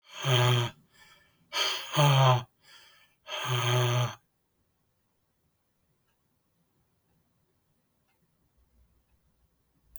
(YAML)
exhalation_length: 10.0 s
exhalation_amplitude: 10566
exhalation_signal_mean_std_ratio: 0.37
survey_phase: beta (2021-08-13 to 2022-03-07)
age: 65+
gender: Male
wearing_mask: 'No'
symptom_fatigue: true
smoker_status: Never smoked
respiratory_condition_asthma: false
respiratory_condition_other: false
recruitment_source: REACT
submission_delay: 3 days
covid_test_result: Negative
covid_test_method: RT-qPCR
influenza_a_test_result: Negative
influenza_b_test_result: Negative